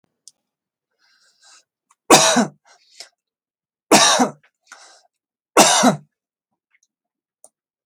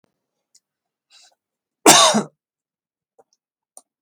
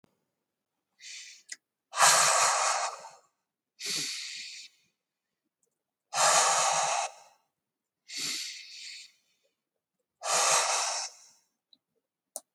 {"three_cough_length": "7.9 s", "three_cough_amplitude": 32768, "three_cough_signal_mean_std_ratio": 0.3, "cough_length": "4.0 s", "cough_amplitude": 32768, "cough_signal_mean_std_ratio": 0.23, "exhalation_length": "12.5 s", "exhalation_amplitude": 14425, "exhalation_signal_mean_std_ratio": 0.44, "survey_phase": "beta (2021-08-13 to 2022-03-07)", "age": "45-64", "gender": "Male", "wearing_mask": "No", "symptom_loss_of_taste": true, "symptom_onset": "9 days", "smoker_status": "Never smoked", "respiratory_condition_asthma": false, "respiratory_condition_other": false, "recruitment_source": "REACT", "submission_delay": "2 days", "covid_test_result": "Negative", "covid_test_method": "RT-qPCR"}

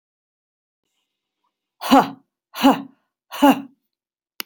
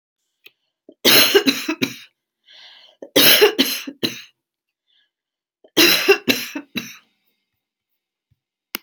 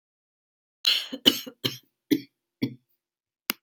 {"exhalation_length": "4.5 s", "exhalation_amplitude": 28705, "exhalation_signal_mean_std_ratio": 0.27, "three_cough_length": "8.8 s", "three_cough_amplitude": 32768, "three_cough_signal_mean_std_ratio": 0.36, "cough_length": "3.6 s", "cough_amplitude": 27942, "cough_signal_mean_std_ratio": 0.27, "survey_phase": "beta (2021-08-13 to 2022-03-07)", "age": "65+", "gender": "Female", "wearing_mask": "No", "symptom_cough_any": true, "smoker_status": "Never smoked", "respiratory_condition_asthma": false, "respiratory_condition_other": false, "recruitment_source": "REACT", "submission_delay": "1 day", "covid_test_result": "Negative", "covid_test_method": "RT-qPCR"}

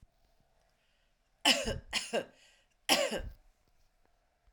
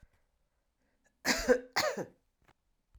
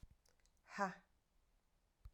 {"three_cough_length": "4.5 s", "three_cough_amplitude": 10363, "three_cough_signal_mean_std_ratio": 0.34, "cough_length": "3.0 s", "cough_amplitude": 6588, "cough_signal_mean_std_ratio": 0.32, "exhalation_length": "2.1 s", "exhalation_amplitude": 1879, "exhalation_signal_mean_std_ratio": 0.27, "survey_phase": "alpha (2021-03-01 to 2021-08-12)", "age": "45-64", "gender": "Female", "wearing_mask": "No", "symptom_cough_any": true, "symptom_headache": true, "symptom_loss_of_taste": true, "symptom_onset": "3 days", "smoker_status": "Never smoked", "respiratory_condition_asthma": false, "respiratory_condition_other": false, "recruitment_source": "Test and Trace", "submission_delay": "1 day", "covid_test_result": "Positive", "covid_test_method": "RT-qPCR", "covid_ct_value": 13.4, "covid_ct_gene": "S gene", "covid_ct_mean": 13.8, "covid_viral_load": "29000000 copies/ml", "covid_viral_load_category": "High viral load (>1M copies/ml)"}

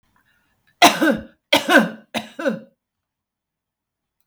{"three_cough_length": "4.3 s", "three_cough_amplitude": 32768, "three_cough_signal_mean_std_ratio": 0.33, "survey_phase": "beta (2021-08-13 to 2022-03-07)", "age": "65+", "gender": "Female", "wearing_mask": "No", "symptom_none": true, "smoker_status": "Ex-smoker", "respiratory_condition_asthma": false, "respiratory_condition_other": false, "recruitment_source": "REACT", "submission_delay": "11 days", "covid_test_result": "Negative", "covid_test_method": "RT-qPCR", "influenza_a_test_result": "Negative", "influenza_b_test_result": "Negative"}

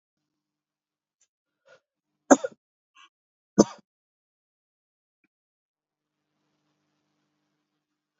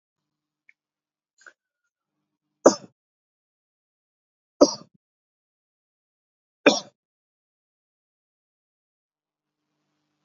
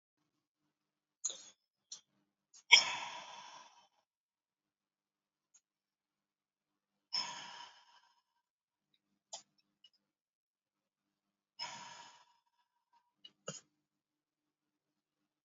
{"cough_length": "8.2 s", "cough_amplitude": 30381, "cough_signal_mean_std_ratio": 0.09, "three_cough_length": "10.2 s", "three_cough_amplitude": 28871, "three_cough_signal_mean_std_ratio": 0.12, "exhalation_length": "15.4 s", "exhalation_amplitude": 12679, "exhalation_signal_mean_std_ratio": 0.15, "survey_phase": "beta (2021-08-13 to 2022-03-07)", "age": "45-64", "gender": "Male", "wearing_mask": "No", "symptom_new_continuous_cough": true, "symptom_other": true, "smoker_status": "Never smoked", "respiratory_condition_asthma": false, "respiratory_condition_other": false, "recruitment_source": "Test and Trace", "submission_delay": "1 day", "covid_test_result": "Positive", "covid_test_method": "RT-qPCR", "covid_ct_value": 15.8, "covid_ct_gene": "N gene", "covid_ct_mean": 16.2, "covid_viral_load": "4800000 copies/ml", "covid_viral_load_category": "High viral load (>1M copies/ml)"}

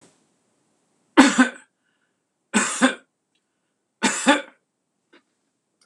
{"three_cough_length": "5.9 s", "three_cough_amplitude": 26028, "three_cough_signal_mean_std_ratio": 0.29, "survey_phase": "beta (2021-08-13 to 2022-03-07)", "age": "65+", "gender": "Male", "wearing_mask": "No", "symptom_none": true, "smoker_status": "Never smoked", "respiratory_condition_asthma": false, "respiratory_condition_other": false, "recruitment_source": "REACT", "submission_delay": "1 day", "covid_test_result": "Negative", "covid_test_method": "RT-qPCR"}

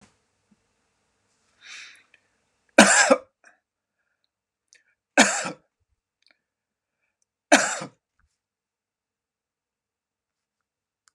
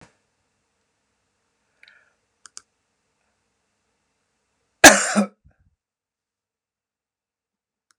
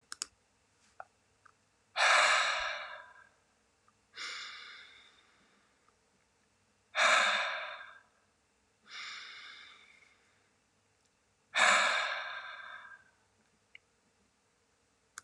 {"three_cough_length": "11.1 s", "three_cough_amplitude": 32767, "three_cough_signal_mean_std_ratio": 0.2, "cough_length": "8.0 s", "cough_amplitude": 32768, "cough_signal_mean_std_ratio": 0.14, "exhalation_length": "15.2 s", "exhalation_amplitude": 7347, "exhalation_signal_mean_std_ratio": 0.35, "survey_phase": "beta (2021-08-13 to 2022-03-07)", "age": "65+", "gender": "Male", "wearing_mask": "No", "symptom_none": true, "smoker_status": "Ex-smoker", "respiratory_condition_asthma": false, "respiratory_condition_other": false, "recruitment_source": "REACT", "submission_delay": "2 days", "covid_test_result": "Negative", "covid_test_method": "RT-qPCR", "influenza_a_test_result": "Negative", "influenza_b_test_result": "Negative"}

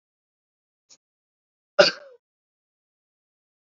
{"cough_length": "3.8 s", "cough_amplitude": 30092, "cough_signal_mean_std_ratio": 0.13, "survey_phase": "beta (2021-08-13 to 2022-03-07)", "age": "18-44", "gender": "Male", "wearing_mask": "No", "symptom_none": true, "smoker_status": "Never smoked", "respiratory_condition_asthma": false, "respiratory_condition_other": false, "recruitment_source": "Test and Trace", "submission_delay": "2 days", "covid_test_result": "Positive", "covid_test_method": "RT-qPCR", "covid_ct_value": 26.1, "covid_ct_gene": "S gene", "covid_ct_mean": 26.5, "covid_viral_load": "2100 copies/ml", "covid_viral_load_category": "Minimal viral load (< 10K copies/ml)"}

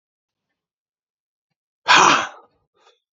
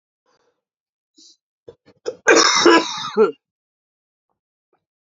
{"exhalation_length": "3.2 s", "exhalation_amplitude": 29878, "exhalation_signal_mean_std_ratio": 0.27, "cough_length": "5.0 s", "cough_amplitude": 32767, "cough_signal_mean_std_ratio": 0.32, "survey_phase": "beta (2021-08-13 to 2022-03-07)", "age": "18-44", "gender": "Male", "wearing_mask": "No", "symptom_cough_any": true, "symptom_fatigue": true, "symptom_onset": "6 days", "smoker_status": "Never smoked", "respiratory_condition_asthma": true, "respiratory_condition_other": false, "recruitment_source": "REACT", "submission_delay": "3 days", "covid_test_result": "Negative", "covid_test_method": "RT-qPCR", "influenza_a_test_result": "Negative", "influenza_b_test_result": "Negative"}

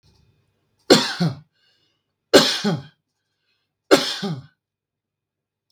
{"three_cough_length": "5.7 s", "three_cough_amplitude": 32768, "three_cough_signal_mean_std_ratio": 0.3, "survey_phase": "beta (2021-08-13 to 2022-03-07)", "age": "45-64", "gender": "Male", "wearing_mask": "No", "symptom_none": true, "smoker_status": "Never smoked", "respiratory_condition_asthma": true, "respiratory_condition_other": false, "recruitment_source": "REACT", "submission_delay": "1 day", "covid_test_result": "Negative", "covid_test_method": "RT-qPCR", "influenza_a_test_result": "Negative", "influenza_b_test_result": "Negative"}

